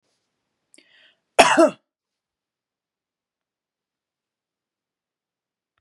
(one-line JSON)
{"cough_length": "5.8 s", "cough_amplitude": 32767, "cough_signal_mean_std_ratio": 0.17, "survey_phase": "beta (2021-08-13 to 2022-03-07)", "age": "45-64", "gender": "Female", "wearing_mask": "No", "symptom_sore_throat": true, "symptom_onset": "9 days", "smoker_status": "Never smoked", "respiratory_condition_asthma": false, "respiratory_condition_other": false, "recruitment_source": "REACT", "submission_delay": "2 days", "covid_test_result": "Negative", "covid_test_method": "RT-qPCR", "influenza_a_test_result": "Negative", "influenza_b_test_result": "Negative"}